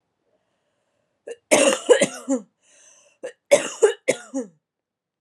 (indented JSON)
{
  "cough_length": "5.2 s",
  "cough_amplitude": 28615,
  "cough_signal_mean_std_ratio": 0.33,
  "survey_phase": "alpha (2021-03-01 to 2021-08-12)",
  "age": "18-44",
  "gender": "Female",
  "wearing_mask": "No",
  "symptom_cough_any": true,
  "symptom_fatigue": true,
  "symptom_headache": true,
  "symptom_change_to_sense_of_smell_or_taste": true,
  "smoker_status": "Ex-smoker",
  "respiratory_condition_asthma": false,
  "respiratory_condition_other": false,
  "recruitment_source": "Test and Trace",
  "submission_delay": "2 days",
  "covid_test_result": "Positive",
  "covid_test_method": "RT-qPCR",
  "covid_ct_value": 22.7,
  "covid_ct_gene": "ORF1ab gene",
  "covid_ct_mean": 23.0,
  "covid_viral_load": "30000 copies/ml",
  "covid_viral_load_category": "Low viral load (10K-1M copies/ml)"
}